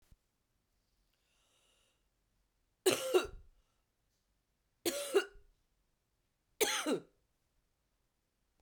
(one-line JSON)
{"three_cough_length": "8.6 s", "three_cough_amplitude": 5921, "three_cough_signal_mean_std_ratio": 0.27, "survey_phase": "beta (2021-08-13 to 2022-03-07)", "age": "45-64", "gender": "Female", "wearing_mask": "No", "symptom_cough_any": true, "symptom_new_continuous_cough": true, "symptom_sore_throat": true, "symptom_fatigue": true, "symptom_fever_high_temperature": true, "symptom_headache": true, "symptom_change_to_sense_of_smell_or_taste": true, "symptom_other": true, "symptom_onset": "5 days", "smoker_status": "Never smoked", "respiratory_condition_asthma": true, "respiratory_condition_other": false, "recruitment_source": "Test and Trace", "submission_delay": "2 days", "covid_test_result": "Positive", "covid_test_method": "ePCR"}